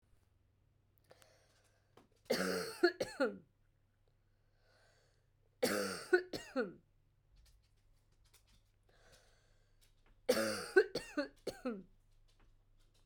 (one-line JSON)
{"three_cough_length": "13.1 s", "three_cough_amplitude": 5543, "three_cough_signal_mean_std_ratio": 0.31, "survey_phase": "alpha (2021-03-01 to 2021-08-12)", "age": "45-64", "gender": "Female", "wearing_mask": "No", "symptom_cough_any": true, "symptom_fatigue": true, "symptom_fever_high_temperature": true, "symptom_headache": true, "symptom_onset": "3 days", "smoker_status": "Never smoked", "respiratory_condition_asthma": false, "respiratory_condition_other": false, "recruitment_source": "Test and Trace", "submission_delay": "1 day", "covid_test_result": "Positive", "covid_test_method": "RT-qPCR", "covid_ct_value": 17.8, "covid_ct_gene": "ORF1ab gene", "covid_ct_mean": 18.4, "covid_viral_load": "940000 copies/ml", "covid_viral_load_category": "Low viral load (10K-1M copies/ml)"}